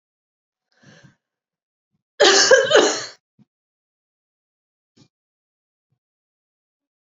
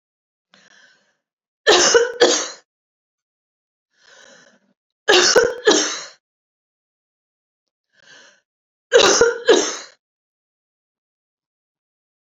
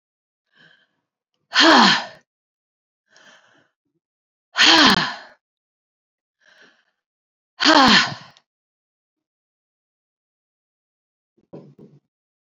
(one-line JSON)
{"cough_length": "7.2 s", "cough_amplitude": 29744, "cough_signal_mean_std_ratio": 0.26, "three_cough_length": "12.2 s", "three_cough_amplitude": 31025, "three_cough_signal_mean_std_ratio": 0.33, "exhalation_length": "12.5 s", "exhalation_amplitude": 32767, "exhalation_signal_mean_std_ratio": 0.27, "survey_phase": "beta (2021-08-13 to 2022-03-07)", "age": "65+", "gender": "Female", "wearing_mask": "No", "symptom_none": true, "smoker_status": "Never smoked", "respiratory_condition_asthma": false, "respiratory_condition_other": false, "recruitment_source": "Test and Trace", "submission_delay": "0 days", "covid_test_result": "Negative", "covid_test_method": "LFT"}